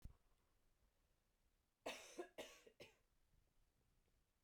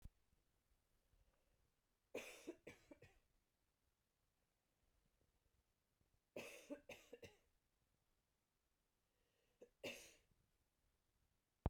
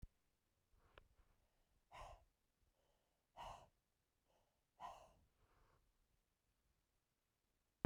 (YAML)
cough_length: 4.4 s
cough_amplitude: 392
cough_signal_mean_std_ratio: 0.36
three_cough_length: 11.7 s
three_cough_amplitude: 1765
three_cough_signal_mean_std_ratio: 0.25
exhalation_length: 7.9 s
exhalation_amplitude: 1810
exhalation_signal_mean_std_ratio: 0.24
survey_phase: beta (2021-08-13 to 2022-03-07)
age: 45-64
gender: Female
wearing_mask: 'No'
symptom_cough_any: true
symptom_runny_or_blocked_nose: true
symptom_shortness_of_breath: true
symptom_sore_throat: true
symptom_fatigue: true
symptom_headache: true
symptom_change_to_sense_of_smell_or_taste: true
symptom_onset: 6 days
smoker_status: Never smoked
respiratory_condition_asthma: false
respiratory_condition_other: false
recruitment_source: Test and Trace
submission_delay: 2 days
covid_test_method: RT-qPCR
covid_ct_value: 34.4
covid_ct_gene: N gene